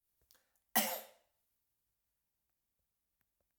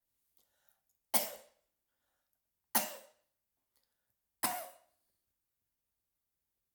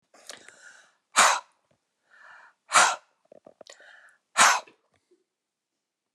{
  "cough_length": "3.6 s",
  "cough_amplitude": 4664,
  "cough_signal_mean_std_ratio": 0.19,
  "three_cough_length": "6.7 s",
  "three_cough_amplitude": 7183,
  "three_cough_signal_mean_std_ratio": 0.2,
  "exhalation_length": "6.1 s",
  "exhalation_amplitude": 22242,
  "exhalation_signal_mean_std_ratio": 0.27,
  "survey_phase": "alpha (2021-03-01 to 2021-08-12)",
  "age": "65+",
  "gender": "Male",
  "wearing_mask": "No",
  "symptom_none": true,
  "smoker_status": "Ex-smoker",
  "respiratory_condition_asthma": false,
  "respiratory_condition_other": false,
  "recruitment_source": "REACT",
  "submission_delay": "1 day",
  "covid_test_result": "Negative",
  "covid_test_method": "RT-qPCR"
}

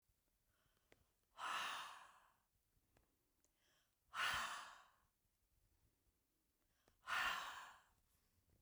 {
  "exhalation_length": "8.6 s",
  "exhalation_amplitude": 1153,
  "exhalation_signal_mean_std_ratio": 0.37,
  "survey_phase": "beta (2021-08-13 to 2022-03-07)",
  "age": "65+",
  "gender": "Female",
  "wearing_mask": "No",
  "symptom_none": true,
  "smoker_status": "Ex-smoker",
  "respiratory_condition_asthma": false,
  "respiratory_condition_other": false,
  "recruitment_source": "REACT",
  "submission_delay": "2 days",
  "covid_test_result": "Negative",
  "covid_test_method": "RT-qPCR"
}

